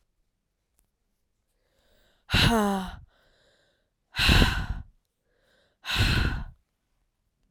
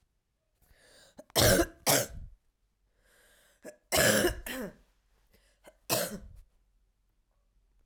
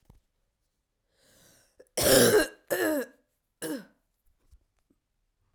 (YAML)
exhalation_length: 7.5 s
exhalation_amplitude: 20511
exhalation_signal_mean_std_ratio: 0.38
three_cough_length: 7.9 s
three_cough_amplitude: 11552
three_cough_signal_mean_std_ratio: 0.34
cough_length: 5.5 s
cough_amplitude: 15892
cough_signal_mean_std_ratio: 0.32
survey_phase: beta (2021-08-13 to 2022-03-07)
age: 18-44
gender: Female
wearing_mask: 'No'
symptom_cough_any: true
symptom_runny_or_blocked_nose: true
symptom_shortness_of_breath: true
symptom_sore_throat: true
symptom_fatigue: true
symptom_headache: true
smoker_status: Never smoked
respiratory_condition_asthma: false
respiratory_condition_other: false
recruitment_source: Test and Trace
submission_delay: 2 days
covid_test_result: Positive
covid_test_method: LFT